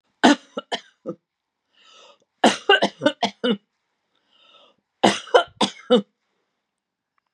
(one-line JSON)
{"three_cough_length": "7.3 s", "three_cough_amplitude": 32754, "three_cough_signal_mean_std_ratio": 0.3, "survey_phase": "beta (2021-08-13 to 2022-03-07)", "age": "65+", "gender": "Female", "wearing_mask": "No", "symptom_cough_any": true, "symptom_shortness_of_breath": true, "symptom_onset": "12 days", "smoker_status": "Never smoked", "respiratory_condition_asthma": false, "respiratory_condition_other": true, "recruitment_source": "REACT", "submission_delay": "2 days", "covid_test_result": "Negative", "covid_test_method": "RT-qPCR", "influenza_a_test_result": "Negative", "influenza_b_test_result": "Negative"}